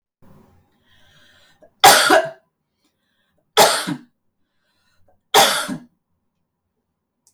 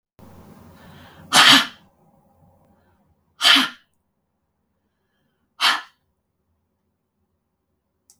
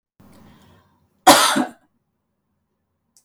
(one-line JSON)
{"three_cough_length": "7.3 s", "three_cough_amplitude": 32766, "three_cough_signal_mean_std_ratio": 0.3, "exhalation_length": "8.2 s", "exhalation_amplitude": 32768, "exhalation_signal_mean_std_ratio": 0.24, "cough_length": "3.2 s", "cough_amplitude": 32768, "cough_signal_mean_std_ratio": 0.26, "survey_phase": "beta (2021-08-13 to 2022-03-07)", "age": "45-64", "gender": "Female", "wearing_mask": "No", "symptom_none": true, "smoker_status": "Ex-smoker", "respiratory_condition_asthma": false, "respiratory_condition_other": false, "recruitment_source": "REACT", "submission_delay": "6 days", "covid_test_result": "Negative", "covid_test_method": "RT-qPCR", "influenza_a_test_result": "Negative", "influenza_b_test_result": "Negative"}